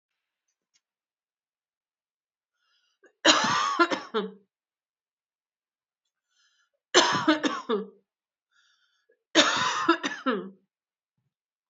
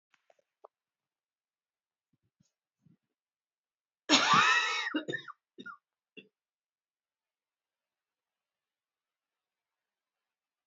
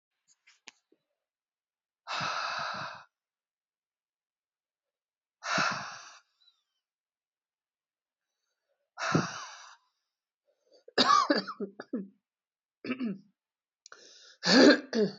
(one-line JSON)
{"three_cough_length": "11.7 s", "three_cough_amplitude": 25070, "three_cough_signal_mean_std_ratio": 0.34, "cough_length": "10.7 s", "cough_amplitude": 12523, "cough_signal_mean_std_ratio": 0.23, "exhalation_length": "15.2 s", "exhalation_amplitude": 13333, "exhalation_signal_mean_std_ratio": 0.3, "survey_phase": "beta (2021-08-13 to 2022-03-07)", "age": "45-64", "gender": "Female", "wearing_mask": "No", "symptom_cough_any": true, "symptom_runny_or_blocked_nose": true, "symptom_sore_throat": true, "symptom_fatigue": true, "symptom_fever_high_temperature": true, "symptom_headache": true, "symptom_other": true, "symptom_onset": "4 days", "smoker_status": "Ex-smoker", "respiratory_condition_asthma": false, "respiratory_condition_other": false, "recruitment_source": "REACT", "submission_delay": "2 days", "covid_test_result": "Positive", "covid_test_method": "RT-qPCR", "covid_ct_value": 16.0, "covid_ct_gene": "E gene", "influenza_a_test_result": "Negative", "influenza_b_test_result": "Negative"}